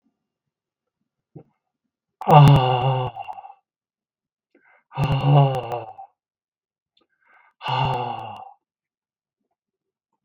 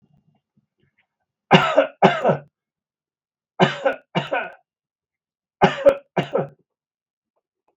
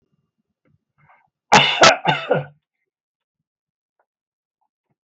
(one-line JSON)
{"exhalation_length": "10.2 s", "exhalation_amplitude": 32768, "exhalation_signal_mean_std_ratio": 0.34, "three_cough_length": "7.8 s", "three_cough_amplitude": 32768, "three_cough_signal_mean_std_ratio": 0.32, "cough_length": "5.0 s", "cough_amplitude": 32768, "cough_signal_mean_std_ratio": 0.27, "survey_phase": "beta (2021-08-13 to 2022-03-07)", "age": "65+", "gender": "Male", "wearing_mask": "No", "symptom_none": true, "smoker_status": "Ex-smoker", "respiratory_condition_asthma": false, "respiratory_condition_other": false, "recruitment_source": "REACT", "submission_delay": "2 days", "covid_test_result": "Negative", "covid_test_method": "RT-qPCR", "influenza_a_test_result": "Negative", "influenza_b_test_result": "Negative"}